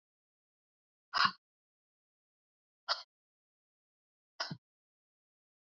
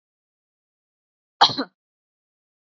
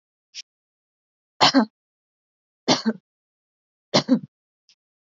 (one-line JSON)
{"exhalation_length": "5.6 s", "exhalation_amplitude": 6163, "exhalation_signal_mean_std_ratio": 0.17, "cough_length": "2.6 s", "cough_amplitude": 28602, "cough_signal_mean_std_ratio": 0.17, "three_cough_length": "5.0 s", "three_cough_amplitude": 27484, "three_cough_signal_mean_std_ratio": 0.26, "survey_phase": "alpha (2021-03-01 to 2021-08-12)", "age": "18-44", "gender": "Female", "wearing_mask": "No", "symptom_fatigue": true, "symptom_headache": true, "symptom_change_to_sense_of_smell_or_taste": true, "symptom_loss_of_taste": true, "symptom_onset": "5 days", "smoker_status": "Never smoked", "respiratory_condition_asthma": false, "respiratory_condition_other": false, "recruitment_source": "Test and Trace", "submission_delay": "3 days", "covid_test_result": "Positive", "covid_test_method": "RT-qPCR"}